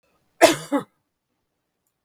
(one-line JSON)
{"cough_length": "2.0 s", "cough_amplitude": 32768, "cough_signal_mean_std_ratio": 0.24, "survey_phase": "beta (2021-08-13 to 2022-03-07)", "age": "45-64", "gender": "Female", "wearing_mask": "No", "symptom_none": true, "smoker_status": "Never smoked", "respiratory_condition_asthma": false, "respiratory_condition_other": false, "recruitment_source": "REACT", "submission_delay": "0 days", "covid_test_result": "Negative", "covid_test_method": "RT-qPCR", "influenza_a_test_result": "Negative", "influenza_b_test_result": "Negative"}